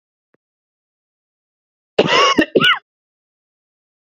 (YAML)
cough_length: 4.0 s
cough_amplitude: 29600
cough_signal_mean_std_ratio: 0.32
survey_phase: beta (2021-08-13 to 2022-03-07)
age: 18-44
gender: Male
wearing_mask: 'No'
symptom_cough_any: true
symptom_runny_or_blocked_nose: true
symptom_shortness_of_breath: true
symptom_sore_throat: true
symptom_diarrhoea: true
symptom_fatigue: true
symptom_fever_high_temperature: true
smoker_status: Ex-smoker
respiratory_condition_asthma: true
respiratory_condition_other: false
recruitment_source: Test and Trace
submission_delay: 2 days
covid_test_result: Positive
covid_test_method: RT-qPCR